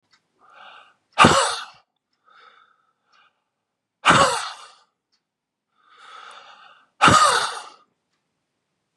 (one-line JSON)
{"exhalation_length": "9.0 s", "exhalation_amplitude": 32766, "exhalation_signal_mean_std_ratio": 0.3, "survey_phase": "beta (2021-08-13 to 2022-03-07)", "age": "18-44", "gender": "Male", "wearing_mask": "No", "symptom_cough_any": true, "symptom_shortness_of_breath": true, "symptom_headache": true, "symptom_onset": "4 days", "smoker_status": "Never smoked", "respiratory_condition_asthma": false, "respiratory_condition_other": false, "recruitment_source": "Test and Trace", "submission_delay": "2 days", "covid_test_result": "Positive", "covid_test_method": "RT-qPCR", "covid_ct_value": 19.4, "covid_ct_gene": "N gene"}